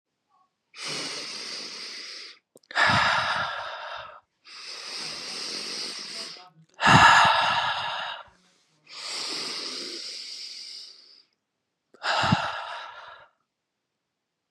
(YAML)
exhalation_length: 14.5 s
exhalation_amplitude: 23131
exhalation_signal_mean_std_ratio: 0.46
survey_phase: beta (2021-08-13 to 2022-03-07)
age: 45-64
gender: Female
wearing_mask: 'No'
symptom_cough_any: true
symptom_headache: true
symptom_other: true
smoker_status: Never smoked
respiratory_condition_asthma: false
respiratory_condition_other: false
recruitment_source: Test and Trace
submission_delay: 2 days
covid_test_result: Positive
covid_test_method: ePCR